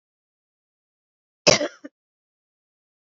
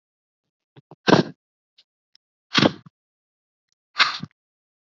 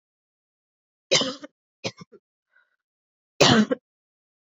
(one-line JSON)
{"cough_length": "3.1 s", "cough_amplitude": 28054, "cough_signal_mean_std_ratio": 0.17, "exhalation_length": "4.9 s", "exhalation_amplitude": 27731, "exhalation_signal_mean_std_ratio": 0.22, "three_cough_length": "4.4 s", "three_cough_amplitude": 27198, "three_cough_signal_mean_std_ratio": 0.26, "survey_phase": "beta (2021-08-13 to 2022-03-07)", "age": "18-44", "gender": "Female", "wearing_mask": "No", "symptom_cough_any": true, "symptom_runny_or_blocked_nose": true, "symptom_shortness_of_breath": true, "symptom_sore_throat": true, "symptom_fatigue": true, "symptom_fever_high_temperature": true, "symptom_onset": "3 days", "smoker_status": "Never smoked", "respiratory_condition_asthma": false, "respiratory_condition_other": false, "recruitment_source": "Test and Trace", "submission_delay": "1 day", "covid_test_method": "ePCR"}